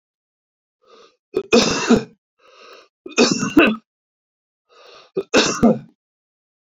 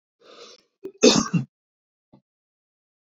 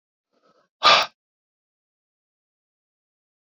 {"three_cough_length": "6.7 s", "three_cough_amplitude": 27915, "three_cough_signal_mean_std_ratio": 0.36, "cough_length": "3.2 s", "cough_amplitude": 28550, "cough_signal_mean_std_ratio": 0.25, "exhalation_length": "3.5 s", "exhalation_amplitude": 26521, "exhalation_signal_mean_std_ratio": 0.19, "survey_phase": "beta (2021-08-13 to 2022-03-07)", "age": "45-64", "gender": "Male", "wearing_mask": "No", "symptom_cough_any": true, "symptom_runny_or_blocked_nose": true, "symptom_abdominal_pain": true, "symptom_fatigue": true, "symptom_headache": true, "symptom_onset": "3 days", "smoker_status": "Ex-smoker", "respiratory_condition_asthma": false, "respiratory_condition_other": false, "recruitment_source": "Test and Trace", "submission_delay": "1 day", "covid_test_result": "Positive", "covid_test_method": "RT-qPCR", "covid_ct_value": 12.0, "covid_ct_gene": "ORF1ab gene", "covid_ct_mean": 12.2, "covid_viral_load": "96000000 copies/ml", "covid_viral_load_category": "High viral load (>1M copies/ml)"}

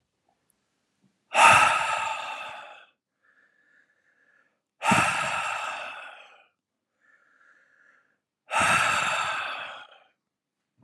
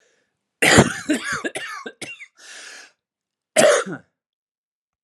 {"exhalation_length": "10.8 s", "exhalation_amplitude": 22516, "exhalation_signal_mean_std_ratio": 0.4, "cough_length": "5.0 s", "cough_amplitude": 32768, "cough_signal_mean_std_ratio": 0.36, "survey_phase": "alpha (2021-03-01 to 2021-08-12)", "age": "45-64", "gender": "Male", "wearing_mask": "No", "symptom_cough_any": true, "symptom_shortness_of_breath": true, "symptom_diarrhoea": true, "symptom_fatigue": true, "symptom_headache": true, "symptom_change_to_sense_of_smell_or_taste": true, "symptom_loss_of_taste": true, "symptom_onset": "5 days", "smoker_status": "Never smoked", "respiratory_condition_asthma": false, "respiratory_condition_other": false, "recruitment_source": "Test and Trace", "submission_delay": "2 days", "covid_test_result": "Positive", "covid_test_method": "RT-qPCR", "covid_ct_value": 19.2, "covid_ct_gene": "N gene", "covid_ct_mean": 19.2, "covid_viral_load": "490000 copies/ml", "covid_viral_load_category": "Low viral load (10K-1M copies/ml)"}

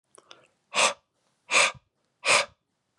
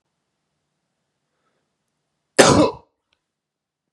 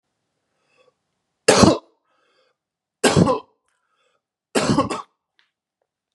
{"exhalation_length": "3.0 s", "exhalation_amplitude": 15662, "exhalation_signal_mean_std_ratio": 0.35, "cough_length": "3.9 s", "cough_amplitude": 32768, "cough_signal_mean_std_ratio": 0.22, "three_cough_length": "6.1 s", "three_cough_amplitude": 32194, "three_cough_signal_mean_std_ratio": 0.3, "survey_phase": "beta (2021-08-13 to 2022-03-07)", "age": "18-44", "gender": "Male", "wearing_mask": "No", "symptom_none": true, "symptom_onset": "10 days", "smoker_status": "Never smoked", "respiratory_condition_asthma": false, "respiratory_condition_other": false, "recruitment_source": "REACT", "submission_delay": "2 days", "covid_test_result": "Positive", "covid_test_method": "RT-qPCR", "covid_ct_value": 23.5, "covid_ct_gene": "E gene", "influenza_a_test_result": "Negative", "influenza_b_test_result": "Negative"}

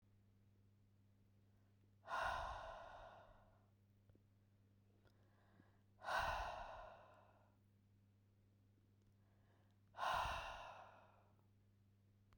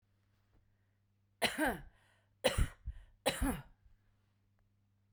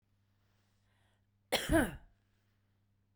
{"exhalation_length": "12.4 s", "exhalation_amplitude": 1147, "exhalation_signal_mean_std_ratio": 0.42, "three_cough_length": "5.1 s", "three_cough_amplitude": 5236, "three_cough_signal_mean_std_ratio": 0.33, "cough_length": "3.2 s", "cough_amplitude": 4719, "cough_signal_mean_std_ratio": 0.26, "survey_phase": "beta (2021-08-13 to 2022-03-07)", "age": "18-44", "gender": "Female", "wearing_mask": "No", "symptom_none": true, "smoker_status": "Ex-smoker", "respiratory_condition_asthma": false, "respiratory_condition_other": false, "recruitment_source": "REACT", "submission_delay": "2 days", "covid_test_result": "Negative", "covid_test_method": "RT-qPCR", "influenza_a_test_result": "Unknown/Void", "influenza_b_test_result": "Unknown/Void"}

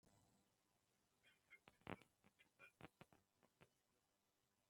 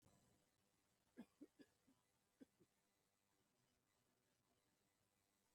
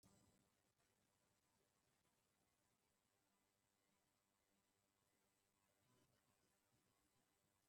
{"three_cough_length": "4.7 s", "three_cough_amplitude": 724, "three_cough_signal_mean_std_ratio": 0.27, "cough_length": "5.5 s", "cough_amplitude": 107, "cough_signal_mean_std_ratio": 0.36, "exhalation_length": "7.7 s", "exhalation_amplitude": 23, "exhalation_signal_mean_std_ratio": 0.79, "survey_phase": "beta (2021-08-13 to 2022-03-07)", "age": "65+", "gender": "Male", "wearing_mask": "No", "symptom_none": true, "smoker_status": "Current smoker (11 or more cigarettes per day)", "respiratory_condition_asthma": false, "respiratory_condition_other": false, "recruitment_source": "REACT", "submission_delay": "2 days", "covid_test_result": "Negative", "covid_test_method": "RT-qPCR", "influenza_a_test_result": "Negative", "influenza_b_test_result": "Negative"}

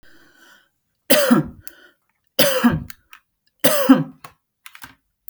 {"three_cough_length": "5.3 s", "three_cough_amplitude": 32768, "three_cough_signal_mean_std_ratio": 0.37, "survey_phase": "beta (2021-08-13 to 2022-03-07)", "age": "18-44", "gender": "Female", "wearing_mask": "No", "symptom_none": true, "smoker_status": "Never smoked", "respiratory_condition_asthma": false, "respiratory_condition_other": false, "recruitment_source": "REACT", "submission_delay": "3 days", "covid_test_result": "Negative", "covid_test_method": "RT-qPCR", "influenza_a_test_result": "Negative", "influenza_b_test_result": "Negative"}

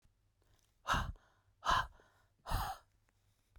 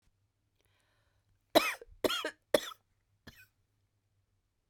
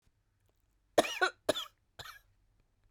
{"exhalation_length": "3.6 s", "exhalation_amplitude": 3808, "exhalation_signal_mean_std_ratio": 0.36, "three_cough_length": "4.7 s", "three_cough_amplitude": 12080, "three_cough_signal_mean_std_ratio": 0.22, "cough_length": "2.9 s", "cough_amplitude": 8386, "cough_signal_mean_std_ratio": 0.25, "survey_phase": "beta (2021-08-13 to 2022-03-07)", "age": "45-64", "gender": "Female", "wearing_mask": "No", "symptom_shortness_of_breath": true, "symptom_sore_throat": true, "symptom_fatigue": true, "symptom_headache": true, "smoker_status": "Ex-smoker", "respiratory_condition_asthma": true, "respiratory_condition_other": false, "recruitment_source": "Test and Trace", "submission_delay": "1 day", "covid_test_result": "Negative", "covid_test_method": "RT-qPCR"}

